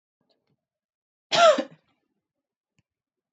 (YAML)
cough_length: 3.3 s
cough_amplitude: 18356
cough_signal_mean_std_ratio: 0.23
survey_phase: beta (2021-08-13 to 2022-03-07)
age: 18-44
gender: Female
wearing_mask: 'No'
symptom_none: true
smoker_status: Never smoked
respiratory_condition_asthma: false
respiratory_condition_other: false
recruitment_source: REACT
submission_delay: 2 days
covid_test_result: Negative
covid_test_method: RT-qPCR
influenza_a_test_result: Negative
influenza_b_test_result: Negative